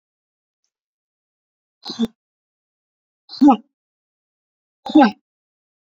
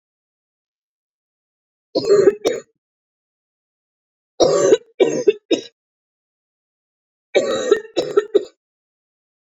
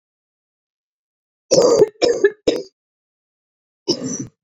exhalation_length: 6.0 s
exhalation_amplitude: 27060
exhalation_signal_mean_std_ratio: 0.21
three_cough_length: 9.5 s
three_cough_amplitude: 27217
three_cough_signal_mean_std_ratio: 0.34
cough_length: 4.4 s
cough_amplitude: 27699
cough_signal_mean_std_ratio: 0.36
survey_phase: beta (2021-08-13 to 2022-03-07)
age: 18-44
gender: Female
wearing_mask: 'No'
symptom_cough_any: true
symptom_runny_or_blocked_nose: true
symptom_sore_throat: true
symptom_abdominal_pain: true
symptom_fatigue: true
symptom_fever_high_temperature: true
symptom_headache: true
symptom_change_to_sense_of_smell_or_taste: true
symptom_loss_of_taste: true
symptom_other: true
symptom_onset: 3 days
smoker_status: Never smoked
respiratory_condition_asthma: false
respiratory_condition_other: false
recruitment_source: Test and Trace
submission_delay: 2 days
covid_test_result: Positive
covid_test_method: RT-qPCR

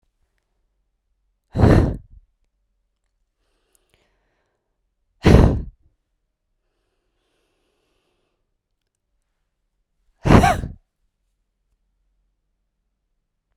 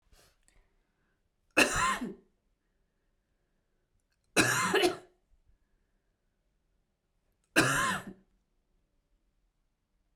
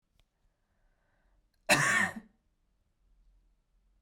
exhalation_length: 13.6 s
exhalation_amplitude: 32768
exhalation_signal_mean_std_ratio: 0.22
three_cough_length: 10.2 s
three_cough_amplitude: 15748
three_cough_signal_mean_std_ratio: 0.3
cough_length: 4.0 s
cough_amplitude: 10986
cough_signal_mean_std_ratio: 0.27
survey_phase: beta (2021-08-13 to 2022-03-07)
age: 18-44
gender: Female
wearing_mask: 'No'
symptom_fatigue: true
symptom_headache: true
symptom_change_to_sense_of_smell_or_taste: true
symptom_loss_of_taste: true
symptom_other: true
smoker_status: Never smoked
respiratory_condition_asthma: true
respiratory_condition_other: false
recruitment_source: Test and Trace
submission_delay: 1 day
covid_test_result: Positive
covid_test_method: RT-qPCR
covid_ct_value: 21.9
covid_ct_gene: ORF1ab gene
covid_ct_mean: 22.9
covid_viral_load: 30000 copies/ml
covid_viral_load_category: Low viral load (10K-1M copies/ml)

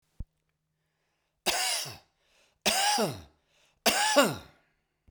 three_cough_length: 5.1 s
three_cough_amplitude: 12937
three_cough_signal_mean_std_ratio: 0.43
survey_phase: beta (2021-08-13 to 2022-03-07)
age: 65+
gender: Male
wearing_mask: 'No'
symptom_cough_any: true
symptom_shortness_of_breath: true
symptom_fatigue: true
symptom_headache: true
symptom_change_to_sense_of_smell_or_taste: true
symptom_loss_of_taste: true
symptom_onset: 5 days
smoker_status: Ex-smoker
respiratory_condition_asthma: false
respiratory_condition_other: false
recruitment_source: Test and Trace
submission_delay: 2 days
covid_test_result: Positive
covid_test_method: ePCR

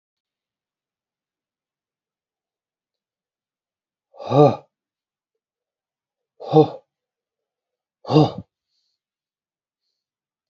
exhalation_length: 10.5 s
exhalation_amplitude: 29274
exhalation_signal_mean_std_ratio: 0.18
survey_phase: beta (2021-08-13 to 2022-03-07)
age: 65+
gender: Male
wearing_mask: 'No'
symptom_cough_any: true
symptom_runny_or_blocked_nose: true
symptom_sore_throat: true
symptom_diarrhoea: true
symptom_fatigue: true
symptom_headache: true
symptom_onset: 3 days
smoker_status: Ex-smoker
respiratory_condition_asthma: true
respiratory_condition_other: false
recruitment_source: REACT
submission_delay: 2 days
covid_test_result: Positive
covid_test_method: RT-qPCR
covid_ct_value: 13.9
covid_ct_gene: E gene
influenza_a_test_result: Negative
influenza_b_test_result: Negative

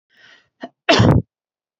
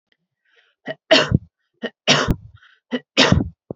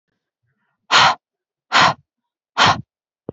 cough_length: 1.8 s
cough_amplitude: 29183
cough_signal_mean_std_ratio: 0.36
three_cough_length: 3.8 s
three_cough_amplitude: 31228
three_cough_signal_mean_std_ratio: 0.37
exhalation_length: 3.3 s
exhalation_amplitude: 30034
exhalation_signal_mean_std_ratio: 0.35
survey_phase: beta (2021-08-13 to 2022-03-07)
age: 18-44
gender: Female
wearing_mask: 'No'
symptom_none: true
smoker_status: Never smoked
respiratory_condition_asthma: false
respiratory_condition_other: false
recruitment_source: REACT
submission_delay: 1 day
covid_test_result: Negative
covid_test_method: RT-qPCR
influenza_a_test_result: Negative
influenza_b_test_result: Negative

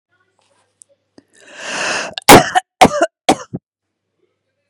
three_cough_length: 4.7 s
three_cough_amplitude: 32768
three_cough_signal_mean_std_ratio: 0.29
survey_phase: beta (2021-08-13 to 2022-03-07)
age: 45-64
gender: Female
wearing_mask: 'No'
symptom_none: true
smoker_status: Ex-smoker
respiratory_condition_asthma: false
respiratory_condition_other: false
recruitment_source: REACT
submission_delay: 1 day
covid_test_result: Negative
covid_test_method: RT-qPCR
influenza_a_test_result: Unknown/Void
influenza_b_test_result: Unknown/Void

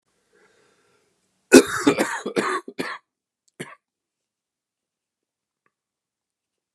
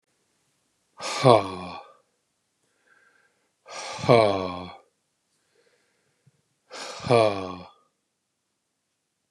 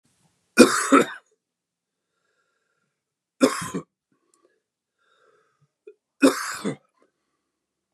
cough_length: 6.7 s
cough_amplitude: 32768
cough_signal_mean_std_ratio: 0.22
exhalation_length: 9.3 s
exhalation_amplitude: 26924
exhalation_signal_mean_std_ratio: 0.28
three_cough_length: 7.9 s
three_cough_amplitude: 32768
three_cough_signal_mean_std_ratio: 0.24
survey_phase: beta (2021-08-13 to 2022-03-07)
age: 65+
gender: Male
wearing_mask: 'No'
symptom_cough_any: true
symptom_runny_or_blocked_nose: true
symptom_fatigue: true
symptom_headache: true
symptom_change_to_sense_of_smell_or_taste: true
symptom_loss_of_taste: true
symptom_other: true
symptom_onset: 4 days
smoker_status: Ex-smoker
respiratory_condition_asthma: true
respiratory_condition_other: false
recruitment_source: Test and Trace
submission_delay: 1 day
covid_test_result: Positive
covid_test_method: RT-qPCR
covid_ct_value: 12.0
covid_ct_gene: ORF1ab gene
covid_ct_mean: 12.2
covid_viral_load: 100000000 copies/ml
covid_viral_load_category: High viral load (>1M copies/ml)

